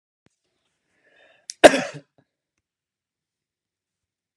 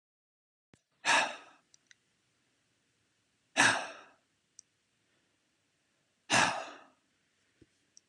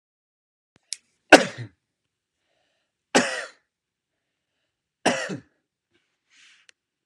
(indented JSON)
{
  "cough_length": "4.4 s",
  "cough_amplitude": 32768,
  "cough_signal_mean_std_ratio": 0.13,
  "exhalation_length": "8.1 s",
  "exhalation_amplitude": 8882,
  "exhalation_signal_mean_std_ratio": 0.26,
  "three_cough_length": "7.1 s",
  "three_cough_amplitude": 32768,
  "three_cough_signal_mean_std_ratio": 0.17,
  "survey_phase": "beta (2021-08-13 to 2022-03-07)",
  "age": "18-44",
  "gender": "Male",
  "wearing_mask": "No",
  "symptom_none": true,
  "smoker_status": "Never smoked",
  "respiratory_condition_asthma": false,
  "respiratory_condition_other": false,
  "recruitment_source": "REACT",
  "submission_delay": "1 day",
  "covid_test_result": "Negative",
  "covid_test_method": "RT-qPCR"
}